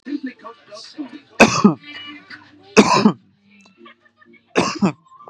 {"three_cough_length": "5.3 s", "three_cough_amplitude": 32768, "three_cough_signal_mean_std_ratio": 0.35, "survey_phase": "beta (2021-08-13 to 2022-03-07)", "age": "18-44", "gender": "Male", "wearing_mask": "No", "symptom_none": true, "smoker_status": "Current smoker (1 to 10 cigarettes per day)", "respiratory_condition_asthma": false, "respiratory_condition_other": false, "recruitment_source": "REACT", "submission_delay": "9 days", "covid_test_result": "Negative", "covid_test_method": "RT-qPCR", "influenza_a_test_result": "Negative", "influenza_b_test_result": "Negative"}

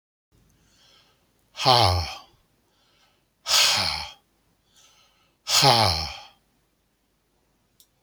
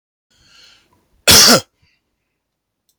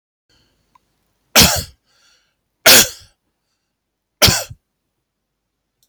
{"exhalation_length": "8.0 s", "exhalation_amplitude": 30281, "exhalation_signal_mean_std_ratio": 0.35, "cough_length": "3.0 s", "cough_amplitude": 32768, "cough_signal_mean_std_ratio": 0.28, "three_cough_length": "5.9 s", "three_cough_amplitude": 32768, "three_cough_signal_mean_std_ratio": 0.26, "survey_phase": "beta (2021-08-13 to 2022-03-07)", "age": "65+", "gender": "Male", "wearing_mask": "No", "symptom_none": true, "symptom_onset": "2 days", "smoker_status": "Never smoked", "respiratory_condition_asthma": false, "respiratory_condition_other": false, "recruitment_source": "REACT", "submission_delay": "2 days", "covid_test_result": "Negative", "covid_test_method": "RT-qPCR", "influenza_a_test_result": "Negative", "influenza_b_test_result": "Negative"}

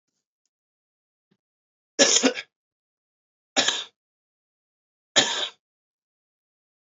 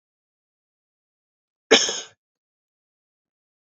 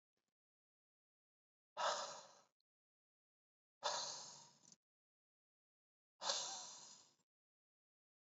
{"three_cough_length": "6.9 s", "three_cough_amplitude": 23362, "three_cough_signal_mean_std_ratio": 0.25, "cough_length": "3.8 s", "cough_amplitude": 27741, "cough_signal_mean_std_ratio": 0.17, "exhalation_length": "8.4 s", "exhalation_amplitude": 1653, "exhalation_signal_mean_std_ratio": 0.32, "survey_phase": "beta (2021-08-13 to 2022-03-07)", "age": "18-44", "gender": "Male", "wearing_mask": "No", "symptom_cough_any": true, "symptom_runny_or_blocked_nose": true, "symptom_sore_throat": true, "smoker_status": "Never smoked", "respiratory_condition_asthma": false, "respiratory_condition_other": false, "recruitment_source": "Test and Trace", "submission_delay": "1 day", "covid_test_result": "Positive", "covid_test_method": "RT-qPCR"}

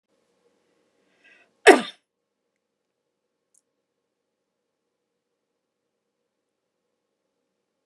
{"cough_length": "7.9 s", "cough_amplitude": 32762, "cough_signal_mean_std_ratio": 0.1, "survey_phase": "beta (2021-08-13 to 2022-03-07)", "age": "65+", "gender": "Female", "wearing_mask": "No", "symptom_none": true, "smoker_status": "Ex-smoker", "respiratory_condition_asthma": false, "respiratory_condition_other": false, "recruitment_source": "REACT", "submission_delay": "2 days", "covid_test_result": "Negative", "covid_test_method": "RT-qPCR"}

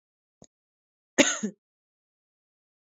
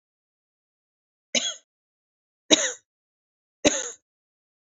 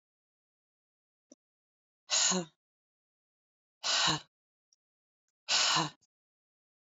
{"cough_length": "2.8 s", "cough_amplitude": 19800, "cough_signal_mean_std_ratio": 0.2, "three_cough_length": "4.6 s", "three_cough_amplitude": 31676, "three_cough_signal_mean_std_ratio": 0.23, "exhalation_length": "6.8 s", "exhalation_amplitude": 5377, "exhalation_signal_mean_std_ratio": 0.32, "survey_phase": "beta (2021-08-13 to 2022-03-07)", "age": "18-44", "gender": "Female", "wearing_mask": "No", "symptom_none": true, "smoker_status": "Current smoker (1 to 10 cigarettes per day)", "respiratory_condition_asthma": false, "respiratory_condition_other": false, "recruitment_source": "REACT", "submission_delay": "1 day", "covid_test_result": "Negative", "covid_test_method": "RT-qPCR", "influenza_a_test_result": "Negative", "influenza_b_test_result": "Negative"}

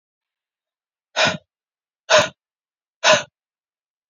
{"exhalation_length": "4.1 s", "exhalation_amplitude": 28692, "exhalation_signal_mean_std_ratio": 0.27, "survey_phase": "beta (2021-08-13 to 2022-03-07)", "age": "18-44", "gender": "Female", "wearing_mask": "No", "symptom_none": true, "smoker_status": "Ex-smoker", "respiratory_condition_asthma": false, "respiratory_condition_other": false, "recruitment_source": "REACT", "submission_delay": "3 days", "covid_test_result": "Negative", "covid_test_method": "RT-qPCR", "influenza_a_test_result": "Negative", "influenza_b_test_result": "Negative"}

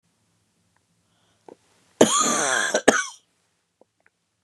{"cough_length": "4.4 s", "cough_amplitude": 32767, "cough_signal_mean_std_ratio": 0.33, "survey_phase": "beta (2021-08-13 to 2022-03-07)", "age": "65+", "gender": "Female", "wearing_mask": "No", "symptom_headache": true, "smoker_status": "Never smoked", "respiratory_condition_asthma": false, "respiratory_condition_other": false, "recruitment_source": "REACT", "submission_delay": "2 days", "covid_test_result": "Negative", "covid_test_method": "RT-qPCR", "influenza_a_test_result": "Negative", "influenza_b_test_result": "Negative"}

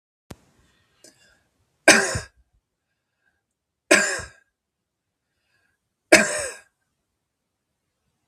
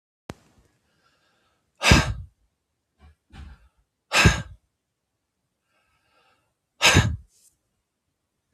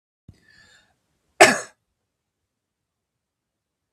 {"three_cough_length": "8.3 s", "three_cough_amplitude": 32768, "three_cough_signal_mean_std_ratio": 0.22, "exhalation_length": "8.5 s", "exhalation_amplitude": 32744, "exhalation_signal_mean_std_ratio": 0.25, "cough_length": "3.9 s", "cough_amplitude": 32768, "cough_signal_mean_std_ratio": 0.15, "survey_phase": "beta (2021-08-13 to 2022-03-07)", "age": "65+", "gender": "Male", "wearing_mask": "No", "symptom_none": true, "smoker_status": "Never smoked", "respiratory_condition_asthma": false, "respiratory_condition_other": false, "recruitment_source": "REACT", "submission_delay": "2 days", "covid_test_result": "Negative", "covid_test_method": "RT-qPCR", "influenza_a_test_result": "Negative", "influenza_b_test_result": "Negative"}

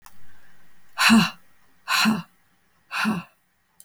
{"exhalation_length": "3.8 s", "exhalation_amplitude": 21958, "exhalation_signal_mean_std_ratio": 0.46, "survey_phase": "beta (2021-08-13 to 2022-03-07)", "age": "18-44", "gender": "Female", "wearing_mask": "No", "symptom_runny_or_blocked_nose": true, "symptom_fatigue": true, "symptom_headache": true, "smoker_status": "Ex-smoker", "respiratory_condition_asthma": false, "respiratory_condition_other": false, "recruitment_source": "Test and Trace", "submission_delay": "1 day", "covid_test_result": "Positive", "covid_test_method": "RT-qPCR", "covid_ct_value": 27.3, "covid_ct_gene": "N gene"}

